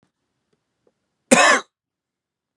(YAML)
cough_length: 2.6 s
cough_amplitude: 32754
cough_signal_mean_std_ratio: 0.26
survey_phase: beta (2021-08-13 to 2022-03-07)
age: 18-44
gender: Male
wearing_mask: 'No'
symptom_cough_any: true
symptom_runny_or_blocked_nose: true
symptom_onset: 13 days
smoker_status: Never smoked
respiratory_condition_asthma: false
respiratory_condition_other: false
recruitment_source: REACT
submission_delay: 0 days
covid_test_result: Negative
covid_test_method: RT-qPCR